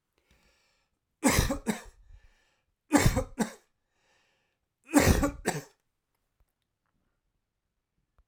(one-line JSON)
{"three_cough_length": "8.3 s", "three_cough_amplitude": 15989, "three_cough_signal_mean_std_ratio": 0.3, "survey_phase": "alpha (2021-03-01 to 2021-08-12)", "age": "45-64", "gender": "Male", "wearing_mask": "No", "symptom_none": true, "smoker_status": "Never smoked", "respiratory_condition_asthma": false, "respiratory_condition_other": false, "recruitment_source": "REACT", "submission_delay": "1 day", "covid_test_result": "Negative", "covid_test_method": "RT-qPCR"}